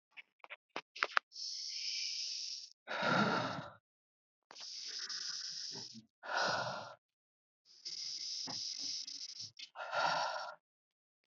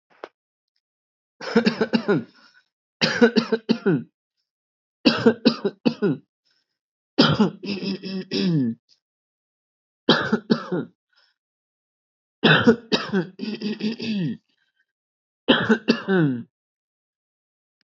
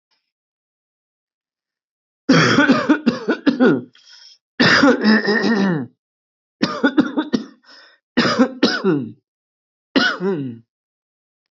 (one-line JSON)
{"exhalation_length": "11.3 s", "exhalation_amplitude": 11586, "exhalation_signal_mean_std_ratio": 0.59, "cough_length": "17.8 s", "cough_amplitude": 24972, "cough_signal_mean_std_ratio": 0.42, "three_cough_length": "11.5 s", "three_cough_amplitude": 25917, "three_cough_signal_mean_std_ratio": 0.5, "survey_phase": "beta (2021-08-13 to 2022-03-07)", "age": "18-44", "gender": "Male", "wearing_mask": "No", "symptom_none": true, "smoker_status": "Ex-smoker", "respiratory_condition_asthma": false, "respiratory_condition_other": false, "recruitment_source": "REACT", "submission_delay": "3 days", "covid_test_result": "Negative", "covid_test_method": "RT-qPCR"}